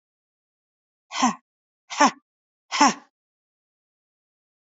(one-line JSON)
{"exhalation_length": "4.6 s", "exhalation_amplitude": 26347, "exhalation_signal_mean_std_ratio": 0.24, "survey_phase": "beta (2021-08-13 to 2022-03-07)", "age": "65+", "gender": "Female", "wearing_mask": "No", "symptom_runny_or_blocked_nose": true, "smoker_status": "Ex-smoker", "respiratory_condition_asthma": false, "respiratory_condition_other": false, "recruitment_source": "REACT", "submission_delay": "2 days", "covid_test_result": "Negative", "covid_test_method": "RT-qPCR", "influenza_a_test_result": "Negative", "influenza_b_test_result": "Negative"}